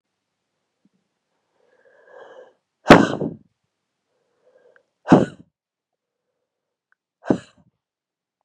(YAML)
exhalation_length: 8.4 s
exhalation_amplitude: 32768
exhalation_signal_mean_std_ratio: 0.17
survey_phase: beta (2021-08-13 to 2022-03-07)
age: 18-44
gender: Female
wearing_mask: 'No'
symptom_cough_any: true
symptom_runny_or_blocked_nose: true
smoker_status: Ex-smoker
respiratory_condition_asthma: false
respiratory_condition_other: false
recruitment_source: Test and Trace
submission_delay: 1 day
covid_test_result: Positive
covid_test_method: LFT